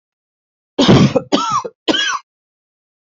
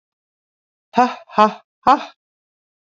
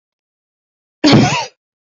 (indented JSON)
{
  "three_cough_length": "3.1 s",
  "three_cough_amplitude": 32768,
  "three_cough_signal_mean_std_ratio": 0.45,
  "exhalation_length": "3.0 s",
  "exhalation_amplitude": 32474,
  "exhalation_signal_mean_std_ratio": 0.27,
  "cough_length": "2.0 s",
  "cough_amplitude": 32767,
  "cough_signal_mean_std_ratio": 0.36,
  "survey_phase": "beta (2021-08-13 to 2022-03-07)",
  "age": "45-64",
  "gender": "Female",
  "wearing_mask": "No",
  "symptom_none": true,
  "smoker_status": "Never smoked",
  "respiratory_condition_asthma": false,
  "respiratory_condition_other": false,
  "recruitment_source": "Test and Trace",
  "submission_delay": "1 day",
  "covid_test_result": "Negative",
  "covid_test_method": "RT-qPCR"
}